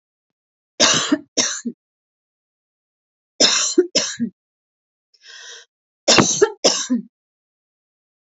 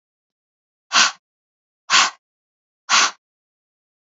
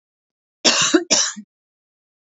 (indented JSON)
{
  "three_cough_length": "8.4 s",
  "three_cough_amplitude": 32768,
  "three_cough_signal_mean_std_ratio": 0.37,
  "exhalation_length": "4.1 s",
  "exhalation_amplitude": 29177,
  "exhalation_signal_mean_std_ratio": 0.29,
  "cough_length": "2.4 s",
  "cough_amplitude": 29817,
  "cough_signal_mean_std_ratio": 0.39,
  "survey_phase": "beta (2021-08-13 to 2022-03-07)",
  "age": "45-64",
  "gender": "Female",
  "wearing_mask": "No",
  "symptom_none": true,
  "smoker_status": "Never smoked",
  "respiratory_condition_asthma": false,
  "respiratory_condition_other": false,
  "recruitment_source": "REACT",
  "submission_delay": "1 day",
  "covid_test_result": "Negative",
  "covid_test_method": "RT-qPCR",
  "influenza_a_test_result": "Negative",
  "influenza_b_test_result": "Negative"
}